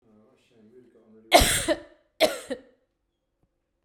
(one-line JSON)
{"cough_length": "3.8 s", "cough_amplitude": 25887, "cough_signal_mean_std_ratio": 0.29, "survey_phase": "beta (2021-08-13 to 2022-03-07)", "age": "45-64", "gender": "Female", "wearing_mask": "No", "symptom_none": true, "smoker_status": "Ex-smoker", "respiratory_condition_asthma": false, "respiratory_condition_other": false, "recruitment_source": "REACT", "submission_delay": "3 days", "covid_test_result": "Negative", "covid_test_method": "RT-qPCR", "influenza_a_test_result": "Unknown/Void", "influenza_b_test_result": "Unknown/Void"}